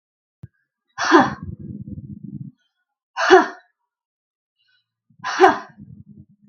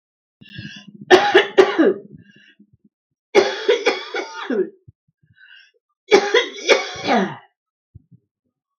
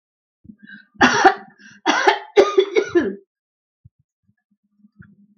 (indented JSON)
{
  "exhalation_length": "6.5 s",
  "exhalation_amplitude": 32768,
  "exhalation_signal_mean_std_ratio": 0.3,
  "three_cough_length": "8.8 s",
  "three_cough_amplitude": 32768,
  "three_cough_signal_mean_std_ratio": 0.4,
  "cough_length": "5.4 s",
  "cough_amplitude": 32768,
  "cough_signal_mean_std_ratio": 0.36,
  "survey_phase": "beta (2021-08-13 to 2022-03-07)",
  "age": "65+",
  "gender": "Female",
  "wearing_mask": "No",
  "symptom_runny_or_blocked_nose": true,
  "symptom_loss_of_taste": true,
  "smoker_status": "Never smoked",
  "respiratory_condition_asthma": false,
  "respiratory_condition_other": false,
  "recruitment_source": "Test and Trace",
  "submission_delay": "3 days",
  "covid_test_result": "Positive",
  "covid_test_method": "RT-qPCR"
}